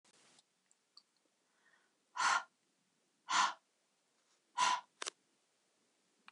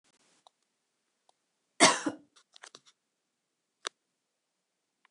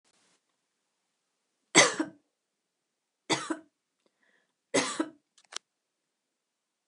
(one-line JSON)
{"exhalation_length": "6.3 s", "exhalation_amplitude": 3889, "exhalation_signal_mean_std_ratio": 0.28, "cough_length": "5.1 s", "cough_amplitude": 15672, "cough_signal_mean_std_ratio": 0.16, "three_cough_length": "6.9 s", "three_cough_amplitude": 17871, "three_cough_signal_mean_std_ratio": 0.22, "survey_phase": "beta (2021-08-13 to 2022-03-07)", "age": "45-64", "gender": "Female", "wearing_mask": "No", "symptom_runny_or_blocked_nose": true, "smoker_status": "Never smoked", "respiratory_condition_asthma": false, "respiratory_condition_other": false, "recruitment_source": "REACT", "submission_delay": "2 days", "covid_test_result": "Negative", "covid_test_method": "RT-qPCR", "influenza_a_test_result": "Negative", "influenza_b_test_result": "Negative"}